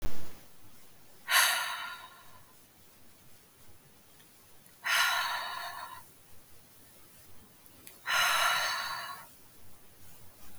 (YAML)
exhalation_length: 10.6 s
exhalation_amplitude: 9016
exhalation_signal_mean_std_ratio: 0.49
survey_phase: beta (2021-08-13 to 2022-03-07)
age: 45-64
gender: Female
wearing_mask: 'No'
symptom_cough_any: true
symptom_runny_or_blocked_nose: true
symptom_fatigue: true
symptom_headache: true
smoker_status: Never smoked
respiratory_condition_asthma: false
respiratory_condition_other: false
recruitment_source: REACT
submission_delay: 1 day
covid_test_result: Negative
covid_test_method: RT-qPCR
influenza_a_test_result: Negative
influenza_b_test_result: Negative